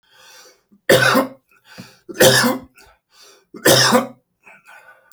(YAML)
three_cough_length: 5.1 s
three_cough_amplitude: 32767
three_cough_signal_mean_std_ratio: 0.41
survey_phase: alpha (2021-03-01 to 2021-08-12)
age: 45-64
gender: Male
wearing_mask: 'No'
symptom_none: true
smoker_status: Current smoker (11 or more cigarettes per day)
respiratory_condition_asthma: false
respiratory_condition_other: false
recruitment_source: REACT
submission_delay: 1 day
covid_test_result: Negative
covid_test_method: RT-qPCR